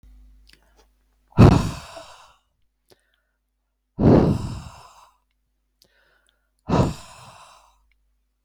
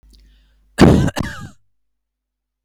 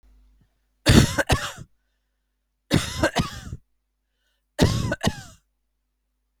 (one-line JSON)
{"exhalation_length": "8.4 s", "exhalation_amplitude": 32768, "exhalation_signal_mean_std_ratio": 0.27, "cough_length": "2.6 s", "cough_amplitude": 32768, "cough_signal_mean_std_ratio": 0.3, "three_cough_length": "6.4 s", "three_cough_amplitude": 32767, "three_cough_signal_mean_std_ratio": 0.34, "survey_phase": "beta (2021-08-13 to 2022-03-07)", "age": "65+", "gender": "Female", "wearing_mask": "No", "symptom_none": true, "smoker_status": "Never smoked", "respiratory_condition_asthma": false, "respiratory_condition_other": false, "recruitment_source": "REACT", "submission_delay": "2 days", "covid_test_result": "Negative", "covid_test_method": "RT-qPCR", "influenza_a_test_result": "Negative", "influenza_b_test_result": "Negative"}